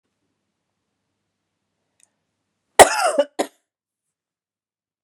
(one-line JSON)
{"cough_length": "5.0 s", "cough_amplitude": 32768, "cough_signal_mean_std_ratio": 0.18, "survey_phase": "beta (2021-08-13 to 2022-03-07)", "age": "18-44", "gender": "Female", "wearing_mask": "No", "symptom_cough_any": true, "symptom_runny_or_blocked_nose": true, "symptom_sore_throat": true, "symptom_fatigue": true, "symptom_headache": true, "symptom_change_to_sense_of_smell_or_taste": true, "smoker_status": "Never smoked", "respiratory_condition_asthma": false, "respiratory_condition_other": false, "recruitment_source": "Test and Trace", "submission_delay": "2 days", "covid_test_result": "Positive", "covid_test_method": "RT-qPCR", "covid_ct_value": 32.5, "covid_ct_gene": "ORF1ab gene", "covid_ct_mean": 32.5, "covid_viral_load": "22 copies/ml", "covid_viral_load_category": "Minimal viral load (< 10K copies/ml)"}